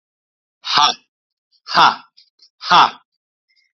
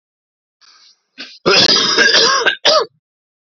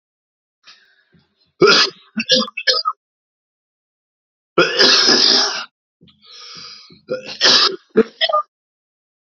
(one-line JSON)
{"exhalation_length": "3.8 s", "exhalation_amplitude": 30678, "exhalation_signal_mean_std_ratio": 0.33, "cough_length": "3.6 s", "cough_amplitude": 30445, "cough_signal_mean_std_ratio": 0.53, "three_cough_length": "9.4 s", "three_cough_amplitude": 32768, "three_cough_signal_mean_std_ratio": 0.42, "survey_phase": "beta (2021-08-13 to 2022-03-07)", "age": "18-44", "gender": "Male", "wearing_mask": "No", "symptom_none": true, "smoker_status": "Ex-smoker", "respiratory_condition_asthma": false, "respiratory_condition_other": false, "recruitment_source": "Test and Trace", "submission_delay": "2 days", "covid_test_result": "Positive", "covid_test_method": "RT-qPCR", "covid_ct_value": 31.6, "covid_ct_gene": "ORF1ab gene", "covid_ct_mean": 32.9, "covid_viral_load": "17 copies/ml", "covid_viral_load_category": "Minimal viral load (< 10K copies/ml)"}